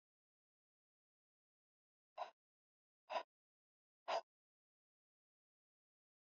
{
  "exhalation_length": "6.3 s",
  "exhalation_amplitude": 1058,
  "exhalation_signal_mean_std_ratio": 0.17,
  "survey_phase": "alpha (2021-03-01 to 2021-08-12)",
  "age": "45-64",
  "gender": "Female",
  "wearing_mask": "No",
  "symptom_fatigue": true,
  "symptom_headache": true,
  "smoker_status": "Never smoked",
  "respiratory_condition_asthma": false,
  "respiratory_condition_other": false,
  "recruitment_source": "Test and Trace",
  "submission_delay": "1 day",
  "covid_test_result": "Positive",
  "covid_test_method": "RT-qPCR",
  "covid_ct_value": 30.6,
  "covid_ct_gene": "ORF1ab gene",
  "covid_ct_mean": 31.4,
  "covid_viral_load": "52 copies/ml",
  "covid_viral_load_category": "Minimal viral load (< 10K copies/ml)"
}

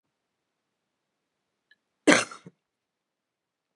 {
  "cough_length": "3.8 s",
  "cough_amplitude": 29434,
  "cough_signal_mean_std_ratio": 0.15,
  "survey_phase": "beta (2021-08-13 to 2022-03-07)",
  "age": "18-44",
  "gender": "Female",
  "wearing_mask": "No",
  "symptom_cough_any": true,
  "symptom_sore_throat": true,
  "smoker_status": "Never smoked",
  "respiratory_condition_asthma": false,
  "respiratory_condition_other": false,
  "recruitment_source": "REACT",
  "submission_delay": "1 day",
  "covid_test_result": "Negative",
  "covid_test_method": "RT-qPCR",
  "covid_ct_value": 39.0,
  "covid_ct_gene": "N gene",
  "influenza_a_test_result": "Negative",
  "influenza_b_test_result": "Negative"
}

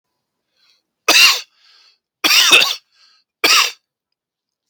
{
  "three_cough_length": "4.7 s",
  "three_cough_amplitude": 32768,
  "three_cough_signal_mean_std_ratio": 0.38,
  "survey_phase": "beta (2021-08-13 to 2022-03-07)",
  "age": "18-44",
  "gender": "Male",
  "wearing_mask": "No",
  "symptom_cough_any": true,
  "symptom_runny_or_blocked_nose": true,
  "symptom_headache": true,
  "symptom_other": true,
  "smoker_status": "Never smoked",
  "respiratory_condition_asthma": false,
  "respiratory_condition_other": false,
  "recruitment_source": "Test and Trace",
  "submission_delay": "0 days",
  "covid_test_result": "Positive",
  "covid_test_method": "LFT"
}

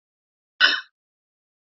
{
  "cough_length": "1.8 s",
  "cough_amplitude": 29974,
  "cough_signal_mean_std_ratio": 0.24,
  "survey_phase": "beta (2021-08-13 to 2022-03-07)",
  "age": "18-44",
  "gender": "Female",
  "wearing_mask": "No",
  "symptom_runny_or_blocked_nose": true,
  "symptom_sore_throat": true,
  "symptom_fatigue": true,
  "symptom_headache": true,
  "symptom_other": true,
  "smoker_status": "Ex-smoker",
  "respiratory_condition_asthma": false,
  "respiratory_condition_other": false,
  "recruitment_source": "Test and Trace",
  "submission_delay": "1 day",
  "covid_test_result": "Positive",
  "covid_test_method": "RT-qPCR",
  "covid_ct_value": 27.7,
  "covid_ct_gene": "N gene",
  "covid_ct_mean": 28.0,
  "covid_viral_load": "660 copies/ml",
  "covid_viral_load_category": "Minimal viral load (< 10K copies/ml)"
}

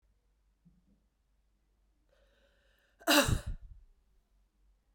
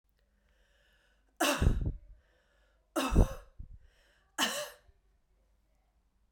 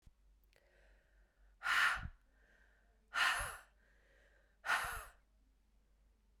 {
  "cough_length": "4.9 s",
  "cough_amplitude": 10126,
  "cough_signal_mean_std_ratio": 0.23,
  "three_cough_length": "6.3 s",
  "three_cough_amplitude": 12609,
  "three_cough_signal_mean_std_ratio": 0.32,
  "exhalation_length": "6.4 s",
  "exhalation_amplitude": 2522,
  "exhalation_signal_mean_std_ratio": 0.36,
  "survey_phase": "beta (2021-08-13 to 2022-03-07)",
  "age": "45-64",
  "gender": "Female",
  "wearing_mask": "No",
  "symptom_runny_or_blocked_nose": true,
  "symptom_sore_throat": true,
  "symptom_fatigue": true,
  "symptom_change_to_sense_of_smell_or_taste": true,
  "symptom_loss_of_taste": true,
  "smoker_status": "Never smoked",
  "respiratory_condition_asthma": false,
  "respiratory_condition_other": false,
  "recruitment_source": "Test and Trace",
  "submission_delay": "2 days",
  "covid_test_result": "Positive",
  "covid_test_method": "LFT"
}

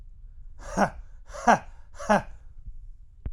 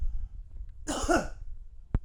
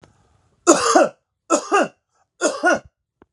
{
  "exhalation_length": "3.3 s",
  "exhalation_amplitude": 18228,
  "exhalation_signal_mean_std_ratio": 0.44,
  "cough_length": "2.0 s",
  "cough_amplitude": 8069,
  "cough_signal_mean_std_ratio": 0.69,
  "three_cough_length": "3.3 s",
  "three_cough_amplitude": 32711,
  "three_cough_signal_mean_std_ratio": 0.43,
  "survey_phase": "alpha (2021-03-01 to 2021-08-12)",
  "age": "18-44",
  "gender": "Male",
  "wearing_mask": "No",
  "symptom_cough_any": true,
  "symptom_fever_high_temperature": true,
  "symptom_headache": true,
  "symptom_onset": "5 days",
  "smoker_status": "Ex-smoker",
  "respiratory_condition_asthma": false,
  "respiratory_condition_other": false,
  "recruitment_source": "Test and Trace",
  "submission_delay": "3 days",
  "covid_test_result": "Positive",
  "covid_test_method": "RT-qPCR",
  "covid_ct_value": 20.2,
  "covid_ct_gene": "ORF1ab gene",
  "covid_ct_mean": 20.8,
  "covid_viral_load": "150000 copies/ml",
  "covid_viral_load_category": "Low viral load (10K-1M copies/ml)"
}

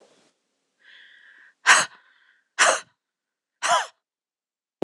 {
  "exhalation_length": "4.8 s",
  "exhalation_amplitude": 25158,
  "exhalation_signal_mean_std_ratio": 0.27,
  "survey_phase": "beta (2021-08-13 to 2022-03-07)",
  "age": "45-64",
  "gender": "Female",
  "wearing_mask": "No",
  "symptom_cough_any": true,
  "symptom_runny_or_blocked_nose": true,
  "symptom_headache": true,
  "symptom_onset": "3 days",
  "smoker_status": "Never smoked",
  "respiratory_condition_asthma": false,
  "respiratory_condition_other": false,
  "recruitment_source": "Test and Trace",
  "submission_delay": "1 day",
  "covid_test_result": "Positive",
  "covid_test_method": "RT-qPCR",
  "covid_ct_value": 21.4,
  "covid_ct_gene": "ORF1ab gene",
  "covid_ct_mean": 21.6,
  "covid_viral_load": "83000 copies/ml",
  "covid_viral_load_category": "Low viral load (10K-1M copies/ml)"
}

